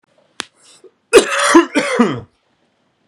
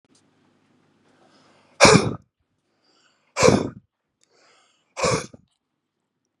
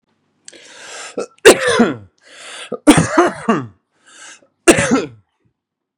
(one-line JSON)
{"cough_length": "3.1 s", "cough_amplitude": 32768, "cough_signal_mean_std_ratio": 0.41, "exhalation_length": "6.4 s", "exhalation_amplitude": 32768, "exhalation_signal_mean_std_ratio": 0.25, "three_cough_length": "6.0 s", "three_cough_amplitude": 32768, "three_cough_signal_mean_std_ratio": 0.38, "survey_phase": "beta (2021-08-13 to 2022-03-07)", "age": "18-44", "gender": "Male", "wearing_mask": "No", "symptom_none": true, "smoker_status": "Current smoker (e-cigarettes or vapes only)", "respiratory_condition_asthma": false, "respiratory_condition_other": false, "recruitment_source": "REACT", "submission_delay": "0 days", "covid_test_result": "Negative", "covid_test_method": "RT-qPCR", "influenza_a_test_result": "Negative", "influenza_b_test_result": "Negative"}